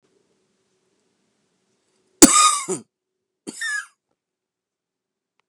cough_length: 5.5 s
cough_amplitude: 32768
cough_signal_mean_std_ratio: 0.22
survey_phase: beta (2021-08-13 to 2022-03-07)
age: 45-64
gender: Male
wearing_mask: 'No'
symptom_runny_or_blocked_nose: true
symptom_sore_throat: true
symptom_fatigue: true
symptom_headache: true
symptom_change_to_sense_of_smell_or_taste: true
symptom_loss_of_taste: true
symptom_onset: 9 days
smoker_status: Ex-smoker
respiratory_condition_asthma: true
respiratory_condition_other: false
recruitment_source: Test and Trace
submission_delay: 2 days
covid_test_result: Positive
covid_test_method: RT-qPCR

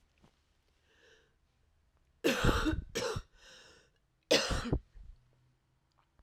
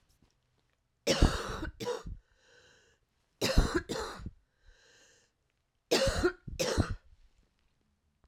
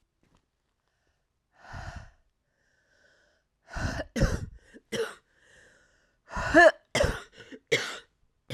cough_length: 6.2 s
cough_amplitude: 8733
cough_signal_mean_std_ratio: 0.36
three_cough_length: 8.3 s
three_cough_amplitude: 11146
three_cough_signal_mean_std_ratio: 0.38
exhalation_length: 8.5 s
exhalation_amplitude: 18343
exhalation_signal_mean_std_ratio: 0.28
survey_phase: alpha (2021-03-01 to 2021-08-12)
age: 45-64
gender: Female
wearing_mask: 'No'
symptom_cough_any: true
symptom_new_continuous_cough: true
symptom_diarrhoea: true
symptom_fatigue: true
symptom_fever_high_temperature: true
symptom_headache: true
symptom_change_to_sense_of_smell_or_taste: true
symptom_loss_of_taste: true
symptom_onset: 4 days
smoker_status: Current smoker (e-cigarettes or vapes only)
respiratory_condition_asthma: false
respiratory_condition_other: false
recruitment_source: Test and Trace
submission_delay: 2 days
covid_test_result: Positive
covid_test_method: RT-qPCR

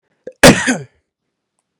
cough_length: 1.8 s
cough_amplitude: 32768
cough_signal_mean_std_ratio: 0.3
survey_phase: beta (2021-08-13 to 2022-03-07)
age: 18-44
gender: Male
wearing_mask: 'No'
symptom_none: true
smoker_status: Never smoked
respiratory_condition_asthma: true
respiratory_condition_other: false
recruitment_source: REACT
submission_delay: 2 days
covid_test_result: Negative
covid_test_method: RT-qPCR
influenza_a_test_result: Negative
influenza_b_test_result: Negative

